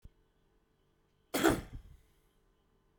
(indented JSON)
{
  "cough_length": "3.0 s",
  "cough_amplitude": 6683,
  "cough_signal_mean_std_ratio": 0.26,
  "survey_phase": "beta (2021-08-13 to 2022-03-07)",
  "age": "45-64",
  "gender": "Male",
  "wearing_mask": "No",
  "symptom_none": true,
  "smoker_status": "Never smoked",
  "respiratory_condition_asthma": false,
  "respiratory_condition_other": false,
  "recruitment_source": "REACT",
  "submission_delay": "2 days",
  "covid_test_result": "Negative",
  "covid_test_method": "RT-qPCR",
  "influenza_a_test_result": "Negative",
  "influenza_b_test_result": "Negative"
}